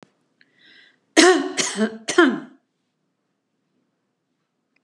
{"three_cough_length": "4.8 s", "three_cough_amplitude": 32619, "three_cough_signal_mean_std_ratio": 0.31, "survey_phase": "beta (2021-08-13 to 2022-03-07)", "age": "65+", "gender": "Female", "wearing_mask": "No", "symptom_none": true, "smoker_status": "Never smoked", "respiratory_condition_asthma": false, "respiratory_condition_other": false, "recruitment_source": "REACT", "submission_delay": "1 day", "covid_test_result": "Negative", "covid_test_method": "RT-qPCR", "influenza_a_test_result": "Negative", "influenza_b_test_result": "Negative"}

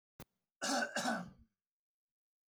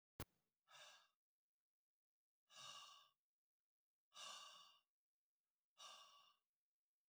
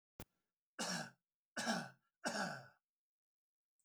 {"cough_length": "2.5 s", "cough_amplitude": 1855, "cough_signal_mean_std_ratio": 0.41, "exhalation_length": "7.1 s", "exhalation_amplitude": 533, "exhalation_signal_mean_std_ratio": 0.37, "three_cough_length": "3.8 s", "three_cough_amplitude": 1842, "three_cough_signal_mean_std_ratio": 0.41, "survey_phase": "alpha (2021-03-01 to 2021-08-12)", "age": "45-64", "gender": "Male", "wearing_mask": "No", "symptom_none": true, "smoker_status": "Ex-smoker", "respiratory_condition_asthma": false, "respiratory_condition_other": false, "recruitment_source": "REACT", "submission_delay": "1 day", "covid_test_result": "Negative", "covid_test_method": "RT-qPCR"}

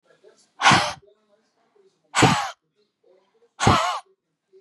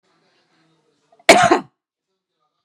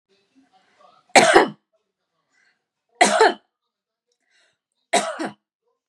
{"exhalation_length": "4.6 s", "exhalation_amplitude": 27300, "exhalation_signal_mean_std_ratio": 0.35, "cough_length": "2.6 s", "cough_amplitude": 32768, "cough_signal_mean_std_ratio": 0.25, "three_cough_length": "5.9 s", "three_cough_amplitude": 32768, "three_cough_signal_mean_std_ratio": 0.28, "survey_phase": "beta (2021-08-13 to 2022-03-07)", "age": "45-64", "gender": "Female", "wearing_mask": "No", "symptom_none": true, "smoker_status": "Never smoked", "respiratory_condition_asthma": false, "respiratory_condition_other": false, "recruitment_source": "REACT", "submission_delay": "0 days", "covid_test_result": "Negative", "covid_test_method": "RT-qPCR", "influenza_a_test_result": "Negative", "influenza_b_test_result": "Negative"}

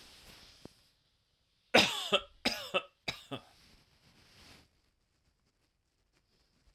{"cough_length": "6.7 s", "cough_amplitude": 11858, "cough_signal_mean_std_ratio": 0.24, "survey_phase": "alpha (2021-03-01 to 2021-08-12)", "age": "45-64", "gender": "Male", "wearing_mask": "No", "symptom_none": true, "smoker_status": "Ex-smoker", "respiratory_condition_asthma": false, "respiratory_condition_other": false, "recruitment_source": "REACT", "submission_delay": "1 day", "covid_test_result": "Negative", "covid_test_method": "RT-qPCR"}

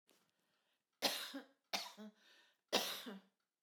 {"three_cough_length": "3.6 s", "three_cough_amplitude": 3199, "three_cough_signal_mean_std_ratio": 0.37, "survey_phase": "beta (2021-08-13 to 2022-03-07)", "age": "45-64", "gender": "Female", "wearing_mask": "No", "symptom_none": true, "smoker_status": "Never smoked", "respiratory_condition_asthma": false, "respiratory_condition_other": false, "recruitment_source": "REACT", "submission_delay": "1 day", "covid_test_result": "Negative", "covid_test_method": "RT-qPCR"}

